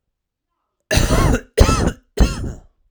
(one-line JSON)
{"cough_length": "2.9 s", "cough_amplitude": 32768, "cough_signal_mean_std_ratio": 0.49, "survey_phase": "alpha (2021-03-01 to 2021-08-12)", "age": "18-44", "gender": "Male", "wearing_mask": "No", "symptom_diarrhoea": true, "smoker_status": "Never smoked", "respiratory_condition_asthma": true, "respiratory_condition_other": false, "recruitment_source": "REACT", "submission_delay": "1 day", "covid_test_result": "Negative", "covid_test_method": "RT-qPCR"}